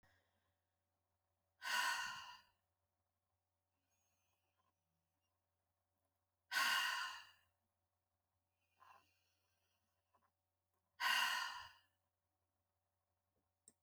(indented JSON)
{
  "exhalation_length": "13.8 s",
  "exhalation_amplitude": 1742,
  "exhalation_signal_mean_std_ratio": 0.29,
  "survey_phase": "alpha (2021-03-01 to 2021-08-12)",
  "age": "45-64",
  "gender": "Female",
  "wearing_mask": "No",
  "symptom_none": true,
  "symptom_fatigue": true,
  "smoker_status": "Never smoked",
  "respiratory_condition_asthma": true,
  "respiratory_condition_other": false,
  "recruitment_source": "REACT",
  "submission_delay": "2 days",
  "covid_test_result": "Negative",
  "covid_test_method": "RT-qPCR"
}